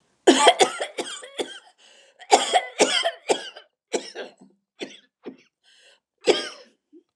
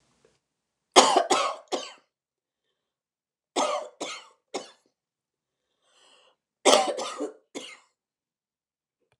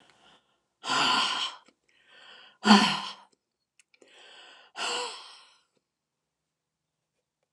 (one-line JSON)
{"cough_length": "7.2 s", "cough_amplitude": 29204, "cough_signal_mean_std_ratio": 0.36, "three_cough_length": "9.2 s", "three_cough_amplitude": 29203, "three_cough_signal_mean_std_ratio": 0.28, "exhalation_length": "7.5 s", "exhalation_amplitude": 19930, "exhalation_signal_mean_std_ratio": 0.31, "survey_phase": "beta (2021-08-13 to 2022-03-07)", "age": "65+", "gender": "Female", "wearing_mask": "No", "symptom_cough_any": true, "symptom_onset": "12 days", "smoker_status": "Never smoked", "respiratory_condition_asthma": false, "respiratory_condition_other": false, "recruitment_source": "REACT", "submission_delay": "1 day", "covid_test_result": "Negative", "covid_test_method": "RT-qPCR", "influenza_a_test_result": "Negative", "influenza_b_test_result": "Negative"}